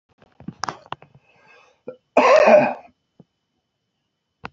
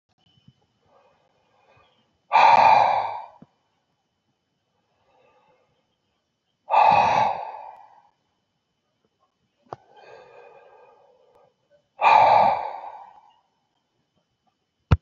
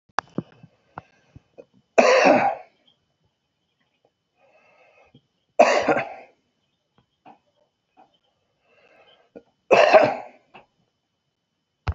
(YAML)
cough_length: 4.5 s
cough_amplitude: 27634
cough_signal_mean_std_ratio: 0.3
exhalation_length: 15.0 s
exhalation_amplitude: 22879
exhalation_signal_mean_std_ratio: 0.32
three_cough_length: 11.9 s
three_cough_amplitude: 28252
three_cough_signal_mean_std_ratio: 0.28
survey_phase: beta (2021-08-13 to 2022-03-07)
age: 65+
gender: Male
wearing_mask: 'No'
symptom_runny_or_blocked_nose: true
symptom_shortness_of_breath: true
smoker_status: Ex-smoker
respiratory_condition_asthma: false
respiratory_condition_other: false
recruitment_source: REACT
submission_delay: 1 day
covid_test_result: Negative
covid_test_method: RT-qPCR